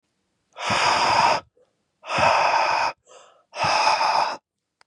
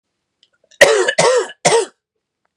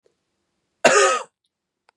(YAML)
exhalation_length: 4.9 s
exhalation_amplitude: 16658
exhalation_signal_mean_std_ratio: 0.65
three_cough_length: 2.6 s
three_cough_amplitude: 32768
three_cough_signal_mean_std_ratio: 0.46
cough_length: 2.0 s
cough_amplitude: 31316
cough_signal_mean_std_ratio: 0.34
survey_phase: beta (2021-08-13 to 2022-03-07)
age: 18-44
gender: Male
wearing_mask: 'No'
symptom_cough_any: true
symptom_runny_or_blocked_nose: true
symptom_shortness_of_breath: true
symptom_fatigue: true
symptom_headache: true
symptom_other: true
symptom_onset: 3 days
smoker_status: Never smoked
respiratory_condition_asthma: true
respiratory_condition_other: false
recruitment_source: Test and Trace
submission_delay: 2 days
covid_test_result: Positive
covid_test_method: RT-qPCR
covid_ct_value: 23.7
covid_ct_gene: N gene
covid_ct_mean: 24.1
covid_viral_load: 12000 copies/ml
covid_viral_load_category: Low viral load (10K-1M copies/ml)